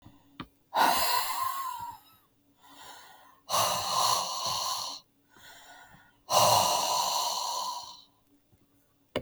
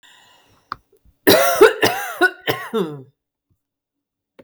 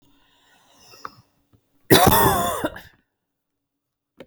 {
  "exhalation_length": "9.2 s",
  "exhalation_amplitude": 9981,
  "exhalation_signal_mean_std_ratio": 0.58,
  "three_cough_length": "4.4 s",
  "three_cough_amplitude": 32768,
  "three_cough_signal_mean_std_ratio": 0.37,
  "cough_length": "4.3 s",
  "cough_amplitude": 32768,
  "cough_signal_mean_std_ratio": 0.32,
  "survey_phase": "beta (2021-08-13 to 2022-03-07)",
  "age": "45-64",
  "gender": "Female",
  "wearing_mask": "No",
  "symptom_fatigue": true,
  "smoker_status": "Ex-smoker",
  "respiratory_condition_asthma": false,
  "respiratory_condition_other": false,
  "recruitment_source": "REACT",
  "submission_delay": "2 days",
  "covid_test_result": "Negative",
  "covid_test_method": "RT-qPCR",
  "influenza_a_test_result": "Negative",
  "influenza_b_test_result": "Negative"
}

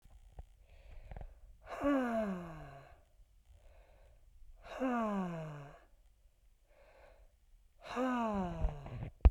{
  "exhalation_length": "9.3 s",
  "exhalation_amplitude": 8873,
  "exhalation_signal_mean_std_ratio": 0.42,
  "survey_phase": "beta (2021-08-13 to 2022-03-07)",
  "age": "45-64",
  "gender": "Female",
  "wearing_mask": "No",
  "symptom_fatigue": true,
  "symptom_headache": true,
  "symptom_onset": "9 days",
  "smoker_status": "Never smoked",
  "respiratory_condition_asthma": false,
  "respiratory_condition_other": false,
  "recruitment_source": "REACT",
  "submission_delay": "3 days",
  "covid_test_result": "Positive",
  "covid_test_method": "RT-qPCR",
  "covid_ct_value": 27.0,
  "covid_ct_gene": "E gene",
  "influenza_a_test_result": "Negative",
  "influenza_b_test_result": "Negative"
}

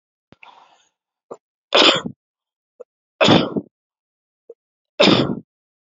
{
  "three_cough_length": "5.8 s",
  "three_cough_amplitude": 32767,
  "three_cough_signal_mean_std_ratio": 0.32,
  "survey_phase": "beta (2021-08-13 to 2022-03-07)",
  "age": "45-64",
  "gender": "Male",
  "wearing_mask": "No",
  "symptom_cough_any": true,
  "symptom_runny_or_blocked_nose": true,
  "symptom_sore_throat": true,
  "symptom_abdominal_pain": true,
  "symptom_fatigue": true,
  "symptom_fever_high_temperature": true,
  "symptom_headache": true,
  "smoker_status": "Never smoked",
  "respiratory_condition_asthma": false,
  "respiratory_condition_other": false,
  "recruitment_source": "Test and Trace",
  "submission_delay": "2 days",
  "covid_test_result": "Positive",
  "covid_test_method": "LFT"
}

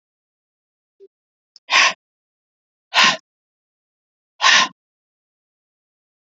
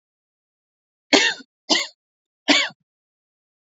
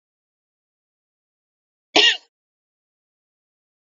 {
  "exhalation_length": "6.3 s",
  "exhalation_amplitude": 32768,
  "exhalation_signal_mean_std_ratio": 0.26,
  "three_cough_length": "3.8 s",
  "three_cough_amplitude": 32767,
  "three_cough_signal_mean_std_ratio": 0.29,
  "cough_length": "3.9 s",
  "cough_amplitude": 27761,
  "cough_signal_mean_std_ratio": 0.17,
  "survey_phase": "beta (2021-08-13 to 2022-03-07)",
  "age": "18-44",
  "gender": "Female",
  "wearing_mask": "No",
  "symptom_none": true,
  "smoker_status": "Never smoked",
  "respiratory_condition_asthma": false,
  "respiratory_condition_other": false,
  "recruitment_source": "REACT",
  "submission_delay": "2 days",
  "covid_test_result": "Negative",
  "covid_test_method": "RT-qPCR",
  "influenza_a_test_result": "Negative",
  "influenza_b_test_result": "Negative"
}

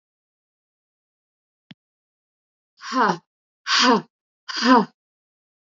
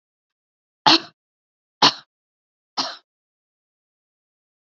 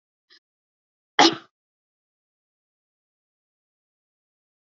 {
  "exhalation_length": "5.6 s",
  "exhalation_amplitude": 26750,
  "exhalation_signal_mean_std_ratio": 0.3,
  "three_cough_length": "4.7 s",
  "three_cough_amplitude": 32746,
  "three_cough_signal_mean_std_ratio": 0.19,
  "cough_length": "4.8 s",
  "cough_amplitude": 26775,
  "cough_signal_mean_std_ratio": 0.13,
  "survey_phase": "alpha (2021-03-01 to 2021-08-12)",
  "age": "45-64",
  "gender": "Female",
  "wearing_mask": "No",
  "symptom_none": true,
  "smoker_status": "Ex-smoker",
  "respiratory_condition_asthma": false,
  "respiratory_condition_other": false,
  "recruitment_source": "REACT",
  "submission_delay": "2 days",
  "covid_test_result": "Negative",
  "covid_test_method": "RT-qPCR"
}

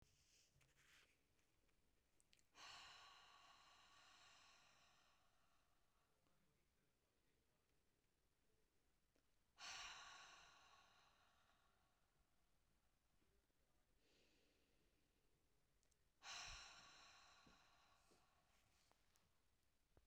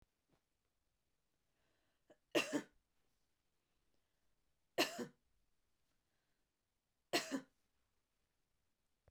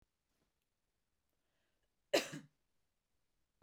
{
  "exhalation_length": "20.1 s",
  "exhalation_amplitude": 216,
  "exhalation_signal_mean_std_ratio": 0.5,
  "three_cough_length": "9.1 s",
  "three_cough_amplitude": 3201,
  "three_cough_signal_mean_std_ratio": 0.21,
  "cough_length": "3.6 s",
  "cough_amplitude": 3801,
  "cough_signal_mean_std_ratio": 0.16,
  "survey_phase": "beta (2021-08-13 to 2022-03-07)",
  "age": "45-64",
  "gender": "Female",
  "wearing_mask": "No",
  "symptom_none": true,
  "smoker_status": "Never smoked",
  "respiratory_condition_asthma": false,
  "respiratory_condition_other": false,
  "recruitment_source": "Test and Trace",
  "submission_delay": "1 day",
  "covid_test_result": "Positive",
  "covid_test_method": "LAMP"
}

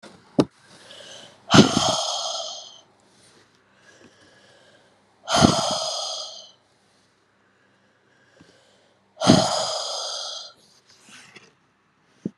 {
  "exhalation_length": "12.4 s",
  "exhalation_amplitude": 32768,
  "exhalation_signal_mean_std_ratio": 0.34,
  "survey_phase": "beta (2021-08-13 to 2022-03-07)",
  "age": "45-64",
  "gender": "Female",
  "wearing_mask": "No",
  "symptom_cough_any": true,
  "symptom_runny_or_blocked_nose": true,
  "symptom_sore_throat": true,
  "symptom_change_to_sense_of_smell_or_taste": true,
  "symptom_onset": "4 days",
  "smoker_status": "Never smoked",
  "respiratory_condition_asthma": false,
  "respiratory_condition_other": false,
  "recruitment_source": "Test and Trace",
  "submission_delay": "2 days",
  "covid_test_result": "Positive",
  "covid_test_method": "RT-qPCR",
  "covid_ct_value": 20.9,
  "covid_ct_gene": "ORF1ab gene"
}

